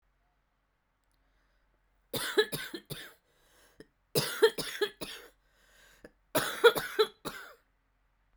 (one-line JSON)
{"three_cough_length": "8.4 s", "three_cough_amplitude": 15347, "three_cough_signal_mean_std_ratio": 0.3, "survey_phase": "beta (2021-08-13 to 2022-03-07)", "age": "18-44", "gender": "Female", "wearing_mask": "No", "symptom_cough_any": true, "symptom_runny_or_blocked_nose": true, "symptom_sore_throat": true, "symptom_abdominal_pain": true, "symptom_diarrhoea": true, "symptom_headache": true, "symptom_other": true, "symptom_onset": "2 days", "smoker_status": "Prefer not to say", "respiratory_condition_asthma": false, "respiratory_condition_other": false, "recruitment_source": "Test and Trace", "submission_delay": "1 day", "covid_test_result": "Positive", "covid_test_method": "RT-qPCR"}